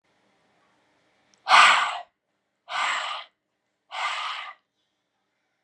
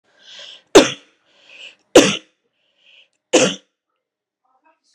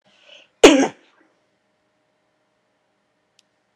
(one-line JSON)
{"exhalation_length": "5.6 s", "exhalation_amplitude": 26485, "exhalation_signal_mean_std_ratio": 0.32, "three_cough_length": "4.9 s", "three_cough_amplitude": 32768, "three_cough_signal_mean_std_ratio": 0.24, "cough_length": "3.8 s", "cough_amplitude": 32768, "cough_signal_mean_std_ratio": 0.19, "survey_phase": "alpha (2021-03-01 to 2021-08-12)", "age": "18-44", "gender": "Female", "wearing_mask": "No", "symptom_headache": true, "symptom_onset": "12 days", "smoker_status": "Ex-smoker", "respiratory_condition_asthma": false, "respiratory_condition_other": false, "recruitment_source": "REACT", "submission_delay": "2 days", "covid_test_result": "Negative", "covid_test_method": "RT-qPCR"}